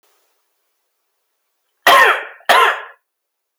cough_length: 3.6 s
cough_amplitude: 30684
cough_signal_mean_std_ratio: 0.34
survey_phase: alpha (2021-03-01 to 2021-08-12)
age: 18-44
gender: Male
wearing_mask: 'No'
symptom_none: true
smoker_status: Never smoked
respiratory_condition_asthma: false
respiratory_condition_other: false
recruitment_source: REACT
submission_delay: 1 day
covid_test_result: Negative
covid_test_method: RT-qPCR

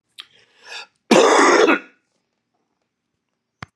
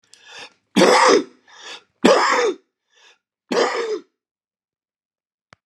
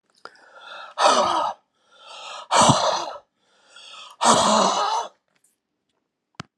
cough_length: 3.8 s
cough_amplitude: 32767
cough_signal_mean_std_ratio: 0.36
three_cough_length: 5.7 s
three_cough_amplitude: 32768
three_cough_signal_mean_std_ratio: 0.41
exhalation_length: 6.6 s
exhalation_amplitude: 27480
exhalation_signal_mean_std_ratio: 0.47
survey_phase: alpha (2021-03-01 to 2021-08-12)
age: 65+
gender: Male
wearing_mask: 'No'
symptom_new_continuous_cough: true
symptom_shortness_of_breath: true
symptom_diarrhoea: true
symptom_fatigue: true
symptom_onset: 4 days
smoker_status: Never smoked
respiratory_condition_asthma: true
respiratory_condition_other: false
recruitment_source: Test and Trace
submission_delay: 2 days
covid_test_result: Positive
covid_test_method: RT-qPCR
covid_ct_value: 14.6
covid_ct_gene: ORF1ab gene
covid_ct_mean: 15.1
covid_viral_load: 11000000 copies/ml
covid_viral_load_category: High viral load (>1M copies/ml)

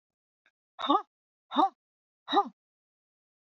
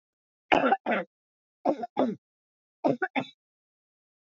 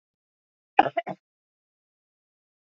exhalation_length: 3.4 s
exhalation_amplitude: 9780
exhalation_signal_mean_std_ratio: 0.28
three_cough_length: 4.4 s
three_cough_amplitude: 16371
three_cough_signal_mean_std_ratio: 0.36
cough_length: 2.6 s
cough_amplitude: 25520
cough_signal_mean_std_ratio: 0.14
survey_phase: beta (2021-08-13 to 2022-03-07)
age: 45-64
gender: Female
wearing_mask: 'No'
symptom_none: true
smoker_status: Never smoked
respiratory_condition_asthma: false
respiratory_condition_other: false
recruitment_source: REACT
submission_delay: 1 day
covid_test_result: Negative
covid_test_method: RT-qPCR
influenza_a_test_result: Negative
influenza_b_test_result: Negative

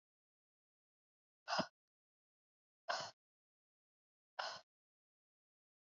exhalation_length: 5.8 s
exhalation_amplitude: 1929
exhalation_signal_mean_std_ratio: 0.22
survey_phase: beta (2021-08-13 to 2022-03-07)
age: 18-44
gender: Female
wearing_mask: 'No'
symptom_none: true
smoker_status: Never smoked
respiratory_condition_asthma: false
respiratory_condition_other: false
recruitment_source: REACT
submission_delay: 1 day
covid_test_result: Negative
covid_test_method: RT-qPCR
influenza_a_test_result: Unknown/Void
influenza_b_test_result: Unknown/Void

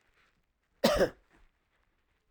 cough_length: 2.3 s
cough_amplitude: 10190
cough_signal_mean_std_ratio: 0.27
survey_phase: alpha (2021-03-01 to 2021-08-12)
age: 45-64
gender: Male
wearing_mask: 'No'
symptom_none: true
smoker_status: Never smoked
respiratory_condition_asthma: false
respiratory_condition_other: false
recruitment_source: REACT
submission_delay: 1 day
covid_test_result: Negative
covid_test_method: RT-qPCR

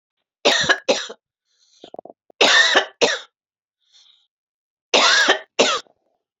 three_cough_length: 6.4 s
three_cough_amplitude: 28901
three_cough_signal_mean_std_ratio: 0.42
survey_phase: alpha (2021-03-01 to 2021-08-12)
age: 45-64
gender: Female
wearing_mask: 'No'
symptom_cough_any: true
symptom_fatigue: true
symptom_change_to_sense_of_smell_or_taste: true
symptom_onset: 5 days
smoker_status: Never smoked
respiratory_condition_asthma: false
respiratory_condition_other: false
recruitment_source: Test and Trace
submission_delay: 2 days
covid_test_result: Positive
covid_test_method: RT-qPCR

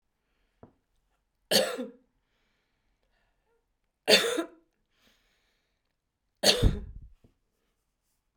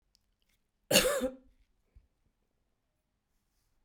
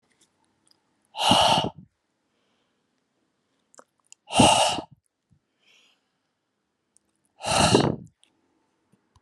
three_cough_length: 8.4 s
three_cough_amplitude: 18782
three_cough_signal_mean_std_ratio: 0.25
cough_length: 3.8 s
cough_amplitude: 10267
cough_signal_mean_std_ratio: 0.24
exhalation_length: 9.2 s
exhalation_amplitude: 21094
exhalation_signal_mean_std_ratio: 0.31
survey_phase: beta (2021-08-13 to 2022-03-07)
age: 65+
gender: Female
wearing_mask: 'No'
symptom_none: true
smoker_status: Never smoked
respiratory_condition_asthma: true
respiratory_condition_other: false
recruitment_source: REACT
submission_delay: 1 day
covid_test_result: Negative
covid_test_method: RT-qPCR
influenza_a_test_result: Unknown/Void
influenza_b_test_result: Unknown/Void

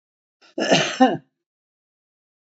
cough_length: 2.5 s
cough_amplitude: 24567
cough_signal_mean_std_ratio: 0.33
survey_phase: beta (2021-08-13 to 2022-03-07)
age: 65+
gender: Female
wearing_mask: 'No'
symptom_cough_any: true
symptom_change_to_sense_of_smell_or_taste: true
symptom_loss_of_taste: true
symptom_other: true
smoker_status: Current smoker (1 to 10 cigarettes per day)
respiratory_condition_asthma: true
respiratory_condition_other: false
recruitment_source: Test and Trace
submission_delay: 2 days
covid_test_result: Positive
covid_test_method: RT-qPCR
covid_ct_value: 25.6
covid_ct_gene: N gene
covid_ct_mean: 26.0
covid_viral_load: 3000 copies/ml
covid_viral_load_category: Minimal viral load (< 10K copies/ml)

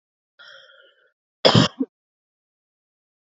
cough_length: 3.3 s
cough_amplitude: 30795
cough_signal_mean_std_ratio: 0.22
survey_phase: beta (2021-08-13 to 2022-03-07)
age: 18-44
gender: Female
wearing_mask: 'No'
symptom_none: true
smoker_status: Ex-smoker
respiratory_condition_asthma: false
respiratory_condition_other: false
recruitment_source: REACT
submission_delay: 1 day
covid_test_result: Negative
covid_test_method: RT-qPCR
influenza_a_test_result: Negative
influenza_b_test_result: Negative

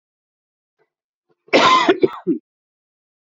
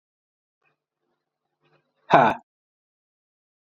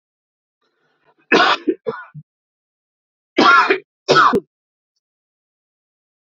cough_length: 3.3 s
cough_amplitude: 28770
cough_signal_mean_std_ratio: 0.34
exhalation_length: 3.7 s
exhalation_amplitude: 27487
exhalation_signal_mean_std_ratio: 0.19
three_cough_length: 6.4 s
three_cough_amplitude: 28446
three_cough_signal_mean_std_ratio: 0.33
survey_phase: beta (2021-08-13 to 2022-03-07)
age: 18-44
gender: Male
wearing_mask: 'No'
symptom_cough_any: true
symptom_runny_or_blocked_nose: true
symptom_sore_throat: true
symptom_diarrhoea: true
symptom_fatigue: true
symptom_headache: true
symptom_onset: 2 days
smoker_status: Ex-smoker
respiratory_condition_asthma: false
respiratory_condition_other: false
recruitment_source: Test and Trace
submission_delay: 1 day
covid_test_result: Positive
covid_test_method: RT-qPCR
covid_ct_value: 16.4
covid_ct_gene: ORF1ab gene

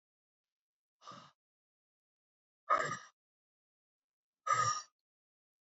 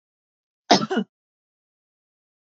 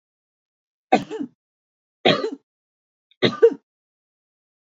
exhalation_length: 5.6 s
exhalation_amplitude: 3914
exhalation_signal_mean_std_ratio: 0.26
cough_length: 2.5 s
cough_amplitude: 28177
cough_signal_mean_std_ratio: 0.22
three_cough_length: 4.6 s
three_cough_amplitude: 26988
three_cough_signal_mean_std_ratio: 0.26
survey_phase: beta (2021-08-13 to 2022-03-07)
age: 45-64
gender: Female
wearing_mask: 'No'
symptom_none: true
symptom_onset: 12 days
smoker_status: Ex-smoker
respiratory_condition_asthma: false
respiratory_condition_other: false
recruitment_source: REACT
submission_delay: 1 day
covid_test_result: Negative
covid_test_method: RT-qPCR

